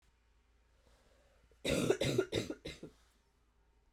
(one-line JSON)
{"cough_length": "3.9 s", "cough_amplitude": 4587, "cough_signal_mean_std_ratio": 0.37, "survey_phase": "alpha (2021-03-01 to 2021-08-12)", "age": "45-64", "gender": "Female", "wearing_mask": "No", "symptom_cough_any": true, "symptom_fatigue": true, "symptom_headache": true, "smoker_status": "Never smoked", "respiratory_condition_asthma": false, "respiratory_condition_other": false, "recruitment_source": "Test and Trace", "submission_delay": "2 days", "covid_test_result": "Positive", "covid_test_method": "RT-qPCR"}